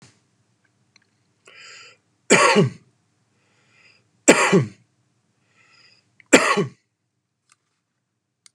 three_cough_length: 8.5 s
three_cough_amplitude: 32768
three_cough_signal_mean_std_ratio: 0.27
survey_phase: beta (2021-08-13 to 2022-03-07)
age: 45-64
gender: Male
wearing_mask: 'No'
symptom_none: true
smoker_status: Ex-smoker
respiratory_condition_asthma: false
respiratory_condition_other: false
recruitment_source: REACT
submission_delay: 0 days
covid_test_result: Negative
covid_test_method: RT-qPCR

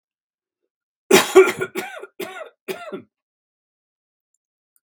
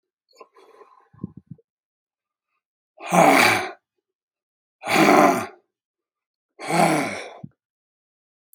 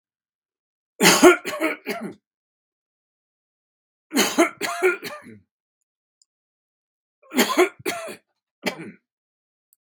cough_length: 4.8 s
cough_amplitude: 32767
cough_signal_mean_std_ratio: 0.26
exhalation_length: 8.5 s
exhalation_amplitude: 32767
exhalation_signal_mean_std_ratio: 0.35
three_cough_length: 9.8 s
three_cough_amplitude: 32738
three_cough_signal_mean_std_ratio: 0.31
survey_phase: beta (2021-08-13 to 2022-03-07)
age: 65+
gender: Male
wearing_mask: 'No'
symptom_none: true
smoker_status: Ex-smoker
respiratory_condition_asthma: false
respiratory_condition_other: false
recruitment_source: REACT
submission_delay: 2 days
covid_test_result: Negative
covid_test_method: RT-qPCR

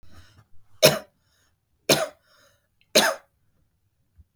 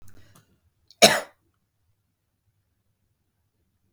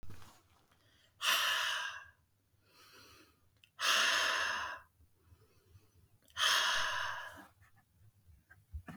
three_cough_length: 4.4 s
three_cough_amplitude: 29293
three_cough_signal_mean_std_ratio: 0.26
cough_length: 3.9 s
cough_amplitude: 32768
cough_signal_mean_std_ratio: 0.15
exhalation_length: 9.0 s
exhalation_amplitude: 4579
exhalation_signal_mean_std_ratio: 0.49
survey_phase: beta (2021-08-13 to 2022-03-07)
age: 18-44
gender: Female
wearing_mask: 'No'
symptom_fatigue: true
symptom_onset: 12 days
smoker_status: Ex-smoker
respiratory_condition_asthma: false
respiratory_condition_other: false
recruitment_source: REACT
submission_delay: 2 days
covid_test_result: Negative
covid_test_method: RT-qPCR
influenza_a_test_result: Negative
influenza_b_test_result: Negative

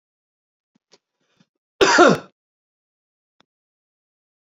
cough_length: 4.4 s
cough_amplitude: 27560
cough_signal_mean_std_ratio: 0.22
survey_phase: beta (2021-08-13 to 2022-03-07)
age: 65+
gender: Male
wearing_mask: 'No'
symptom_none: true
smoker_status: Ex-smoker
respiratory_condition_asthma: false
respiratory_condition_other: true
recruitment_source: REACT
submission_delay: 4 days
covid_test_result: Negative
covid_test_method: RT-qPCR
influenza_a_test_result: Unknown/Void
influenza_b_test_result: Unknown/Void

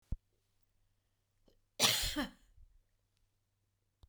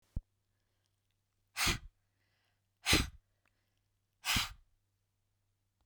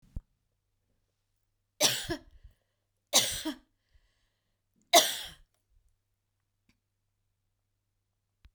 cough_length: 4.1 s
cough_amplitude: 5486
cough_signal_mean_std_ratio: 0.27
exhalation_length: 5.9 s
exhalation_amplitude: 6390
exhalation_signal_mean_std_ratio: 0.27
three_cough_length: 8.5 s
three_cough_amplitude: 16340
three_cough_signal_mean_std_ratio: 0.22
survey_phase: beta (2021-08-13 to 2022-03-07)
age: 65+
gender: Female
wearing_mask: 'No'
symptom_none: true
symptom_onset: 12 days
smoker_status: Ex-smoker
respiratory_condition_asthma: false
respiratory_condition_other: false
recruitment_source: REACT
submission_delay: 1 day
covid_test_result: Negative
covid_test_method: RT-qPCR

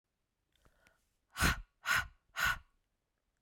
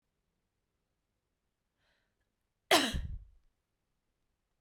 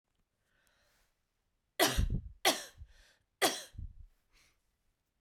exhalation_length: 3.4 s
exhalation_amplitude: 4874
exhalation_signal_mean_std_ratio: 0.33
cough_length: 4.6 s
cough_amplitude: 9625
cough_signal_mean_std_ratio: 0.2
three_cough_length: 5.2 s
three_cough_amplitude: 7434
three_cough_signal_mean_std_ratio: 0.31
survey_phase: beta (2021-08-13 to 2022-03-07)
age: 45-64
gender: Female
wearing_mask: 'No'
symptom_cough_any: true
symptom_runny_or_blocked_nose: true
symptom_fatigue: true
symptom_change_to_sense_of_smell_or_taste: true
symptom_loss_of_taste: true
smoker_status: Prefer not to say
respiratory_condition_asthma: false
respiratory_condition_other: false
recruitment_source: Test and Trace
submission_delay: 2 days
covid_test_result: Positive
covid_test_method: RT-qPCR
covid_ct_value: 30.7
covid_ct_gene: N gene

